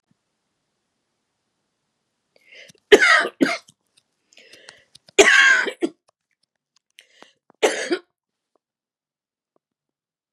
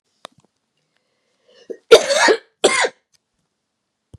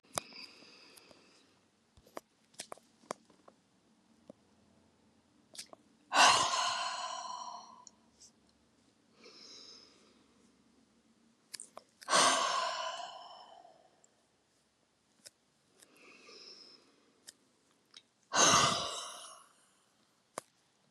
three_cough_length: 10.3 s
three_cough_amplitude: 32768
three_cough_signal_mean_std_ratio: 0.26
cough_length: 4.2 s
cough_amplitude: 32768
cough_signal_mean_std_ratio: 0.29
exhalation_length: 20.9 s
exhalation_amplitude: 9755
exhalation_signal_mean_std_ratio: 0.3
survey_phase: beta (2021-08-13 to 2022-03-07)
age: 45-64
gender: Female
wearing_mask: 'No'
symptom_cough_any: true
symptom_shortness_of_breath: true
symptom_fatigue: true
symptom_onset: 12 days
smoker_status: Never smoked
respiratory_condition_asthma: false
respiratory_condition_other: true
recruitment_source: REACT
submission_delay: 1 day
covid_test_result: Negative
covid_test_method: RT-qPCR
influenza_a_test_result: Negative
influenza_b_test_result: Negative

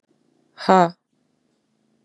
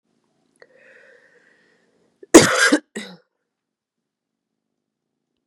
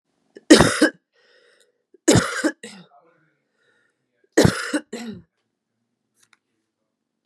exhalation_length: 2.0 s
exhalation_amplitude: 32219
exhalation_signal_mean_std_ratio: 0.22
cough_length: 5.5 s
cough_amplitude: 32768
cough_signal_mean_std_ratio: 0.2
three_cough_length: 7.3 s
three_cough_amplitude: 32768
three_cough_signal_mean_std_ratio: 0.27
survey_phase: beta (2021-08-13 to 2022-03-07)
age: 18-44
gender: Female
wearing_mask: 'No'
symptom_new_continuous_cough: true
symptom_sore_throat: true
symptom_onset: 5 days
smoker_status: Never smoked
respiratory_condition_asthma: false
respiratory_condition_other: false
recruitment_source: Test and Trace
submission_delay: 1 day
covid_test_result: Positive
covid_test_method: RT-qPCR
covid_ct_value: 14.3
covid_ct_gene: ORF1ab gene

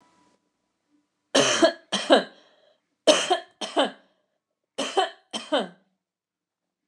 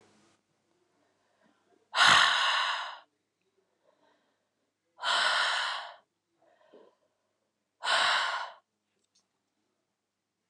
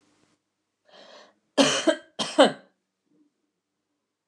three_cough_length: 6.9 s
three_cough_amplitude: 25108
three_cough_signal_mean_std_ratio: 0.35
exhalation_length: 10.5 s
exhalation_amplitude: 12474
exhalation_signal_mean_std_ratio: 0.37
cough_length: 4.3 s
cough_amplitude: 24647
cough_signal_mean_std_ratio: 0.26
survey_phase: beta (2021-08-13 to 2022-03-07)
age: 18-44
gender: Female
wearing_mask: 'Yes'
symptom_cough_any: true
symptom_onset: 11 days
smoker_status: Never smoked
respiratory_condition_asthma: false
respiratory_condition_other: false
recruitment_source: REACT
submission_delay: 0 days
covid_test_result: Negative
covid_test_method: RT-qPCR
influenza_a_test_result: Negative
influenza_b_test_result: Negative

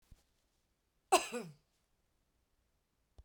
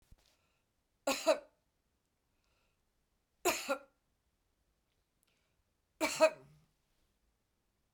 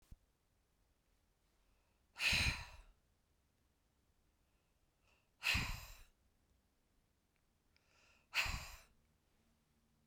cough_length: 3.2 s
cough_amplitude: 7241
cough_signal_mean_std_ratio: 0.18
three_cough_length: 7.9 s
three_cough_amplitude: 6016
three_cough_signal_mean_std_ratio: 0.23
exhalation_length: 10.1 s
exhalation_amplitude: 2247
exhalation_signal_mean_std_ratio: 0.28
survey_phase: beta (2021-08-13 to 2022-03-07)
age: 45-64
gender: Female
wearing_mask: 'No'
symptom_none: true
smoker_status: Never smoked
respiratory_condition_asthma: false
respiratory_condition_other: false
recruitment_source: REACT
submission_delay: 2 days
covid_test_result: Negative
covid_test_method: RT-qPCR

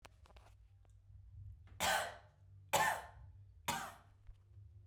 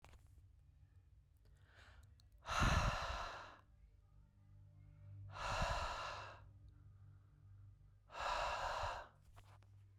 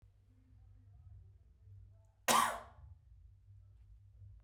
three_cough_length: 4.9 s
three_cough_amplitude: 3137
three_cough_signal_mean_std_ratio: 0.43
exhalation_length: 10.0 s
exhalation_amplitude: 2090
exhalation_signal_mean_std_ratio: 0.51
cough_length: 4.4 s
cough_amplitude: 5659
cough_signal_mean_std_ratio: 0.3
survey_phase: beta (2021-08-13 to 2022-03-07)
age: 18-44
gender: Female
wearing_mask: 'No'
symptom_none: true
smoker_status: Never smoked
respiratory_condition_asthma: false
respiratory_condition_other: false
recruitment_source: Test and Trace
submission_delay: 2 days
covid_test_result: Positive
covid_test_method: RT-qPCR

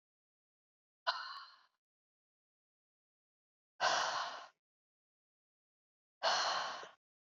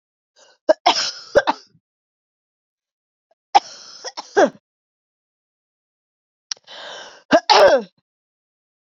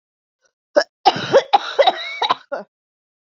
exhalation_length: 7.3 s
exhalation_amplitude: 3764
exhalation_signal_mean_std_ratio: 0.34
three_cough_length: 9.0 s
three_cough_amplitude: 32047
three_cough_signal_mean_std_ratio: 0.27
cough_length: 3.3 s
cough_amplitude: 27822
cough_signal_mean_std_ratio: 0.38
survey_phase: beta (2021-08-13 to 2022-03-07)
age: 45-64
gender: Female
wearing_mask: 'No'
symptom_cough_any: true
symptom_runny_or_blocked_nose: true
symptom_shortness_of_breath: true
symptom_sore_throat: true
symptom_headache: true
symptom_change_to_sense_of_smell_or_taste: true
symptom_onset: 3 days
smoker_status: Never smoked
respiratory_condition_asthma: true
respiratory_condition_other: false
recruitment_source: Test and Trace
submission_delay: 2 days
covid_test_result: Positive
covid_test_method: RT-qPCR
covid_ct_value: 26.1
covid_ct_gene: ORF1ab gene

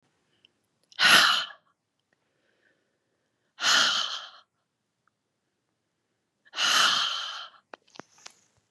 exhalation_length: 8.7 s
exhalation_amplitude: 23839
exhalation_signal_mean_std_ratio: 0.35
survey_phase: beta (2021-08-13 to 2022-03-07)
age: 45-64
gender: Female
wearing_mask: 'No'
symptom_none: true
smoker_status: Never smoked
respiratory_condition_asthma: false
respiratory_condition_other: false
recruitment_source: REACT
submission_delay: 4 days
covid_test_result: Negative
covid_test_method: RT-qPCR
influenza_a_test_result: Negative
influenza_b_test_result: Negative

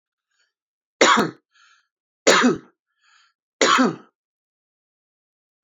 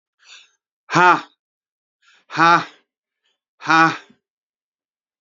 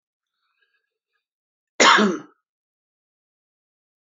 three_cough_length: 5.6 s
three_cough_amplitude: 29981
three_cough_signal_mean_std_ratio: 0.32
exhalation_length: 5.2 s
exhalation_amplitude: 29157
exhalation_signal_mean_std_ratio: 0.3
cough_length: 4.1 s
cough_amplitude: 26718
cough_signal_mean_std_ratio: 0.23
survey_phase: beta (2021-08-13 to 2022-03-07)
age: 45-64
gender: Male
wearing_mask: 'No'
symptom_cough_any: true
symptom_onset: 12 days
smoker_status: Ex-smoker
respiratory_condition_asthma: false
respiratory_condition_other: false
recruitment_source: REACT
submission_delay: 3 days
covid_test_result: Negative
covid_test_method: RT-qPCR
influenza_a_test_result: Negative
influenza_b_test_result: Negative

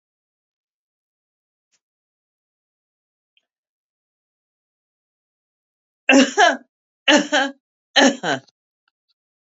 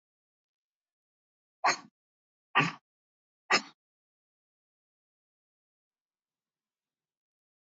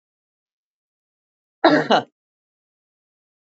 three_cough_length: 9.5 s
three_cough_amplitude: 30648
three_cough_signal_mean_std_ratio: 0.25
exhalation_length: 7.8 s
exhalation_amplitude: 9443
exhalation_signal_mean_std_ratio: 0.17
cough_length: 3.6 s
cough_amplitude: 27321
cough_signal_mean_std_ratio: 0.23
survey_phase: beta (2021-08-13 to 2022-03-07)
age: 45-64
gender: Female
wearing_mask: 'No'
symptom_runny_or_blocked_nose: true
symptom_fatigue: true
smoker_status: Ex-smoker
respiratory_condition_asthma: false
respiratory_condition_other: false
recruitment_source: REACT
submission_delay: 1 day
covid_test_result: Negative
covid_test_method: RT-qPCR
influenza_a_test_result: Negative
influenza_b_test_result: Negative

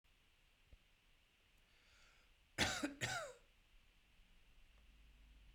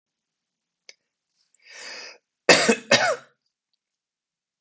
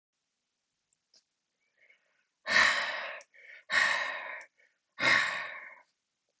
three_cough_length: 5.5 s
three_cough_amplitude: 2496
three_cough_signal_mean_std_ratio: 0.34
cough_length: 4.6 s
cough_amplitude: 27284
cough_signal_mean_std_ratio: 0.26
exhalation_length: 6.4 s
exhalation_amplitude: 8917
exhalation_signal_mean_std_ratio: 0.4
survey_phase: beta (2021-08-13 to 2022-03-07)
age: 45-64
gender: Male
wearing_mask: 'No'
symptom_none: true
smoker_status: Ex-smoker
respiratory_condition_asthma: false
respiratory_condition_other: false
recruitment_source: Test and Trace
submission_delay: 0 days
covid_test_result: Negative
covid_test_method: LFT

